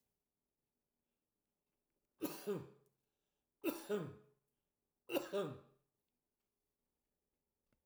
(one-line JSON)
{"three_cough_length": "7.9 s", "three_cough_amplitude": 2233, "three_cough_signal_mean_std_ratio": 0.3, "survey_phase": "alpha (2021-03-01 to 2021-08-12)", "age": "65+", "gender": "Male", "wearing_mask": "No", "symptom_none": true, "smoker_status": "Never smoked", "respiratory_condition_asthma": false, "respiratory_condition_other": false, "recruitment_source": "REACT", "submission_delay": "2 days", "covid_test_result": "Negative", "covid_test_method": "RT-qPCR"}